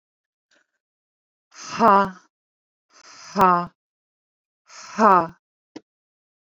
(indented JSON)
{
  "exhalation_length": "6.6 s",
  "exhalation_amplitude": 25195,
  "exhalation_signal_mean_std_ratio": 0.27,
  "survey_phase": "beta (2021-08-13 to 2022-03-07)",
  "age": "18-44",
  "gender": "Female",
  "wearing_mask": "No",
  "symptom_none": true,
  "smoker_status": "Ex-smoker",
  "respiratory_condition_asthma": false,
  "respiratory_condition_other": false,
  "recruitment_source": "REACT",
  "submission_delay": "2 days",
  "covid_test_result": "Negative",
  "covid_test_method": "RT-qPCR"
}